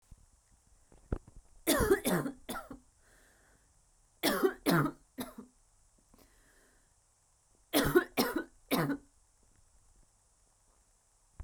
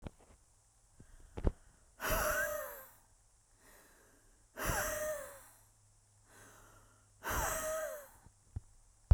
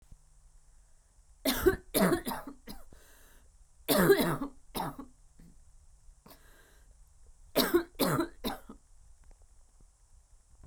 {"three_cough_length": "11.4 s", "three_cough_amplitude": 7557, "three_cough_signal_mean_std_ratio": 0.35, "exhalation_length": "9.1 s", "exhalation_amplitude": 7650, "exhalation_signal_mean_std_ratio": 0.39, "cough_length": "10.7 s", "cough_amplitude": 10256, "cough_signal_mean_std_ratio": 0.38, "survey_phase": "beta (2021-08-13 to 2022-03-07)", "age": "18-44", "gender": "Female", "wearing_mask": "No", "symptom_cough_any": true, "symptom_new_continuous_cough": true, "symptom_runny_or_blocked_nose": true, "symptom_sore_throat": true, "symptom_fatigue": true, "symptom_headache": true, "symptom_onset": "5 days", "smoker_status": "Ex-smoker", "respiratory_condition_asthma": false, "respiratory_condition_other": false, "recruitment_source": "Test and Trace", "submission_delay": "1 day", "covid_test_result": "Positive", "covid_test_method": "RT-qPCR", "covid_ct_value": 31.7, "covid_ct_gene": "N gene"}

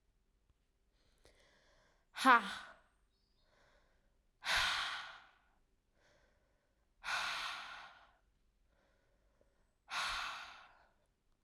{"exhalation_length": "11.4 s", "exhalation_amplitude": 5971, "exhalation_signal_mean_std_ratio": 0.29, "survey_phase": "beta (2021-08-13 to 2022-03-07)", "age": "18-44", "gender": "Female", "wearing_mask": "No", "symptom_cough_any": true, "symptom_new_continuous_cough": true, "symptom_runny_or_blocked_nose": true, "symptom_shortness_of_breath": true, "symptom_fatigue": true, "smoker_status": "Ex-smoker", "respiratory_condition_asthma": false, "respiratory_condition_other": false, "recruitment_source": "Test and Trace", "submission_delay": "2 days", "covid_test_result": "Positive", "covid_test_method": "LFT"}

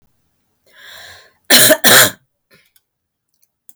{"cough_length": "3.8 s", "cough_amplitude": 32768, "cough_signal_mean_std_ratio": 0.32, "survey_phase": "beta (2021-08-13 to 2022-03-07)", "age": "65+", "gender": "Female", "wearing_mask": "No", "symptom_none": true, "symptom_onset": "13 days", "smoker_status": "Ex-smoker", "respiratory_condition_asthma": false, "respiratory_condition_other": false, "recruitment_source": "REACT", "submission_delay": "1 day", "covid_test_result": "Negative", "covid_test_method": "RT-qPCR"}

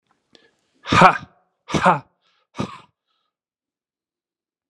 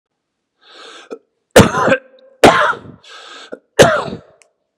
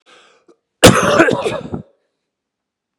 {"exhalation_length": "4.7 s", "exhalation_amplitude": 32768, "exhalation_signal_mean_std_ratio": 0.25, "three_cough_length": "4.8 s", "three_cough_amplitude": 32768, "three_cough_signal_mean_std_ratio": 0.36, "cough_length": "3.0 s", "cough_amplitude": 32768, "cough_signal_mean_std_ratio": 0.37, "survey_phase": "beta (2021-08-13 to 2022-03-07)", "age": "18-44", "gender": "Male", "wearing_mask": "No", "symptom_cough_any": true, "symptom_new_continuous_cough": true, "symptom_runny_or_blocked_nose": true, "symptom_shortness_of_breath": true, "symptom_sore_throat": true, "symptom_fatigue": true, "symptom_headache": true, "symptom_onset": "3 days", "smoker_status": "Never smoked", "respiratory_condition_asthma": false, "respiratory_condition_other": false, "recruitment_source": "Test and Trace", "submission_delay": "2 days", "covid_test_result": "Positive", "covid_test_method": "RT-qPCR", "covid_ct_value": 23.2, "covid_ct_gene": "ORF1ab gene", "covid_ct_mean": 23.6, "covid_viral_load": "18000 copies/ml", "covid_viral_load_category": "Low viral load (10K-1M copies/ml)"}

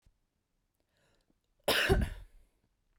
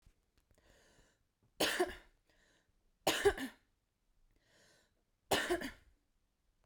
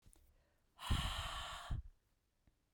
{"cough_length": "3.0 s", "cough_amplitude": 7816, "cough_signal_mean_std_ratio": 0.31, "three_cough_length": "6.7 s", "three_cough_amplitude": 4273, "three_cough_signal_mean_std_ratio": 0.3, "exhalation_length": "2.7 s", "exhalation_amplitude": 1811, "exhalation_signal_mean_std_ratio": 0.48, "survey_phase": "beta (2021-08-13 to 2022-03-07)", "age": "18-44", "gender": "Female", "wearing_mask": "No", "symptom_cough_any": true, "symptom_new_continuous_cough": true, "symptom_shortness_of_breath": true, "symptom_sore_throat": true, "symptom_fatigue": true, "symptom_fever_high_temperature": true, "symptom_headache": true, "symptom_onset": "3 days", "smoker_status": "Never smoked", "respiratory_condition_asthma": true, "respiratory_condition_other": false, "recruitment_source": "Test and Trace", "submission_delay": "2 days", "covid_test_result": "Positive", "covid_test_method": "ePCR"}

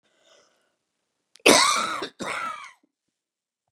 {"cough_length": "3.7 s", "cough_amplitude": 26711, "cough_signal_mean_std_ratio": 0.32, "survey_phase": "beta (2021-08-13 to 2022-03-07)", "age": "45-64", "gender": "Female", "wearing_mask": "No", "symptom_runny_or_blocked_nose": true, "symptom_fatigue": true, "smoker_status": "Ex-smoker", "respiratory_condition_asthma": true, "respiratory_condition_other": false, "recruitment_source": "REACT", "submission_delay": "0 days", "covid_test_result": "Negative", "covid_test_method": "RT-qPCR"}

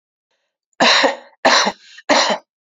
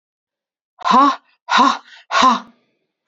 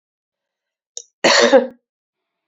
{"three_cough_length": "2.6 s", "three_cough_amplitude": 29309, "three_cough_signal_mean_std_ratio": 0.49, "exhalation_length": "3.1 s", "exhalation_amplitude": 27904, "exhalation_signal_mean_std_ratio": 0.44, "cough_length": "2.5 s", "cough_amplitude": 31113, "cough_signal_mean_std_ratio": 0.33, "survey_phase": "beta (2021-08-13 to 2022-03-07)", "age": "45-64", "gender": "Female", "wearing_mask": "No", "symptom_runny_or_blocked_nose": true, "smoker_status": "Never smoked", "respiratory_condition_asthma": true, "respiratory_condition_other": false, "recruitment_source": "REACT", "submission_delay": "2 days", "covid_test_result": "Negative", "covid_test_method": "RT-qPCR"}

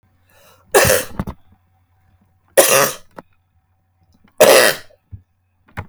{"three_cough_length": "5.9 s", "three_cough_amplitude": 32768, "three_cough_signal_mean_std_ratio": 0.34, "survey_phase": "beta (2021-08-13 to 2022-03-07)", "age": "45-64", "gender": "Female", "wearing_mask": "No", "symptom_none": true, "smoker_status": "Never smoked", "respiratory_condition_asthma": false, "respiratory_condition_other": false, "recruitment_source": "REACT", "submission_delay": "3 days", "covid_test_result": "Negative", "covid_test_method": "RT-qPCR", "influenza_a_test_result": "Negative", "influenza_b_test_result": "Negative"}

